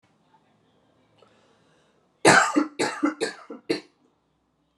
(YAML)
three_cough_length: 4.8 s
three_cough_amplitude: 26736
three_cough_signal_mean_std_ratio: 0.31
survey_phase: alpha (2021-03-01 to 2021-08-12)
age: 18-44
gender: Female
wearing_mask: 'No'
symptom_headache: true
smoker_status: Ex-smoker
respiratory_condition_asthma: false
respiratory_condition_other: false
recruitment_source: Test and Trace
submission_delay: 2 days
covid_test_result: Positive
covid_test_method: RT-qPCR
covid_ct_value: 27.4
covid_ct_gene: N gene
covid_ct_mean: 27.7
covid_viral_load: 830 copies/ml
covid_viral_load_category: Minimal viral load (< 10K copies/ml)